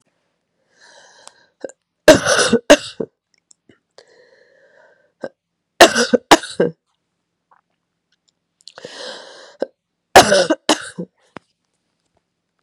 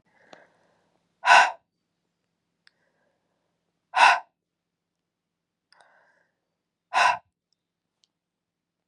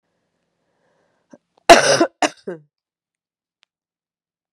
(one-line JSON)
{"three_cough_length": "12.6 s", "three_cough_amplitude": 32768, "three_cough_signal_mean_std_ratio": 0.26, "exhalation_length": "8.9 s", "exhalation_amplitude": 27395, "exhalation_signal_mean_std_ratio": 0.21, "cough_length": "4.5 s", "cough_amplitude": 32768, "cough_signal_mean_std_ratio": 0.22, "survey_phase": "beta (2021-08-13 to 2022-03-07)", "age": "18-44", "gender": "Female", "wearing_mask": "No", "symptom_cough_any": true, "symptom_runny_or_blocked_nose": true, "symptom_sore_throat": true, "symptom_fatigue": true, "symptom_fever_high_temperature": true, "symptom_headache": true, "symptom_other": true, "symptom_onset": "3 days", "smoker_status": "Never smoked", "respiratory_condition_asthma": false, "respiratory_condition_other": false, "recruitment_source": "Test and Trace", "submission_delay": "2 days", "covid_test_result": "Positive", "covid_test_method": "ePCR"}